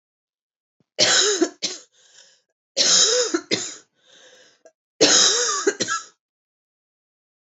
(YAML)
three_cough_length: 7.5 s
three_cough_amplitude: 29192
three_cough_signal_mean_std_ratio: 0.44
survey_phase: beta (2021-08-13 to 2022-03-07)
age: 18-44
gender: Female
wearing_mask: 'No'
symptom_cough_any: true
symptom_sore_throat: true
smoker_status: Never smoked
respiratory_condition_asthma: false
respiratory_condition_other: false
recruitment_source: Test and Trace
submission_delay: 2 days
covid_test_result: Positive
covid_test_method: ePCR